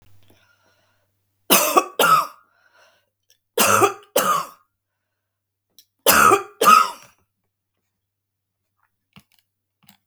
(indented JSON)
{
  "three_cough_length": "10.1 s",
  "three_cough_amplitude": 32768,
  "three_cough_signal_mean_std_ratio": 0.34,
  "survey_phase": "beta (2021-08-13 to 2022-03-07)",
  "age": "65+",
  "gender": "Female",
  "wearing_mask": "No",
  "symptom_none": true,
  "smoker_status": "Never smoked",
  "respiratory_condition_asthma": false,
  "respiratory_condition_other": false,
  "recruitment_source": "REACT",
  "submission_delay": "2 days",
  "covid_test_result": "Negative",
  "covid_test_method": "RT-qPCR"
}